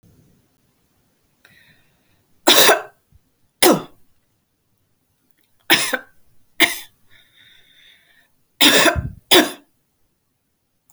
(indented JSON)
{
  "three_cough_length": "10.9 s",
  "three_cough_amplitude": 32768,
  "three_cough_signal_mean_std_ratio": 0.29,
  "survey_phase": "alpha (2021-03-01 to 2021-08-12)",
  "age": "45-64",
  "gender": "Female",
  "wearing_mask": "No",
  "symptom_none": true,
  "smoker_status": "Ex-smoker",
  "respiratory_condition_asthma": false,
  "respiratory_condition_other": false,
  "recruitment_source": "REACT",
  "submission_delay": "5 days",
  "covid_test_result": "Negative",
  "covid_test_method": "RT-qPCR"
}